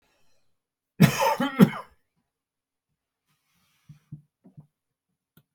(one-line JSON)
{"cough_length": "5.5 s", "cough_amplitude": 27045, "cough_signal_mean_std_ratio": 0.22, "survey_phase": "beta (2021-08-13 to 2022-03-07)", "age": "65+", "gender": "Male", "wearing_mask": "No", "symptom_none": true, "smoker_status": "Ex-smoker", "respiratory_condition_asthma": false, "respiratory_condition_other": false, "recruitment_source": "REACT", "submission_delay": "1 day", "covid_test_result": "Negative", "covid_test_method": "RT-qPCR"}